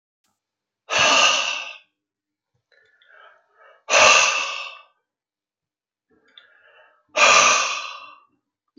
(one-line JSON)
{"exhalation_length": "8.8 s", "exhalation_amplitude": 30951, "exhalation_signal_mean_std_ratio": 0.38, "survey_phase": "beta (2021-08-13 to 2022-03-07)", "age": "65+", "gender": "Male", "wearing_mask": "No", "symptom_cough_any": true, "smoker_status": "Ex-smoker", "respiratory_condition_asthma": false, "respiratory_condition_other": false, "recruitment_source": "REACT", "submission_delay": "3 days", "covid_test_result": "Negative", "covid_test_method": "RT-qPCR", "influenza_a_test_result": "Negative", "influenza_b_test_result": "Negative"}